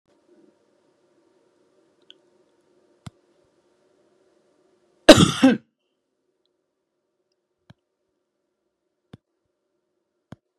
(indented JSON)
{
  "cough_length": "10.6 s",
  "cough_amplitude": 32768,
  "cough_signal_mean_std_ratio": 0.13,
  "survey_phase": "beta (2021-08-13 to 2022-03-07)",
  "age": "65+",
  "gender": "Female",
  "wearing_mask": "No",
  "symptom_none": true,
  "smoker_status": "Never smoked",
  "respiratory_condition_asthma": false,
  "respiratory_condition_other": false,
  "recruitment_source": "REACT",
  "submission_delay": "2 days",
  "covid_test_result": "Negative",
  "covid_test_method": "RT-qPCR",
  "influenza_a_test_result": "Negative",
  "influenza_b_test_result": "Negative"
}